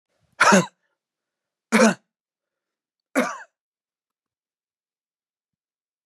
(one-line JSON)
{"three_cough_length": "6.1 s", "three_cough_amplitude": 22645, "three_cough_signal_mean_std_ratio": 0.24, "survey_phase": "beta (2021-08-13 to 2022-03-07)", "age": "45-64", "gender": "Male", "wearing_mask": "No", "symptom_none": true, "smoker_status": "Never smoked", "respiratory_condition_asthma": false, "respiratory_condition_other": false, "recruitment_source": "REACT", "submission_delay": "2 days", "covid_test_result": "Negative", "covid_test_method": "RT-qPCR"}